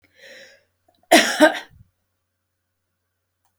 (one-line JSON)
{"three_cough_length": "3.6 s", "three_cough_amplitude": 30743, "three_cough_signal_mean_std_ratio": 0.25, "survey_phase": "beta (2021-08-13 to 2022-03-07)", "age": "65+", "gender": "Female", "wearing_mask": "No", "symptom_runny_or_blocked_nose": true, "symptom_onset": "9 days", "smoker_status": "Ex-smoker", "respiratory_condition_asthma": false, "respiratory_condition_other": false, "recruitment_source": "REACT", "submission_delay": "1 day", "covid_test_result": "Negative", "covid_test_method": "RT-qPCR"}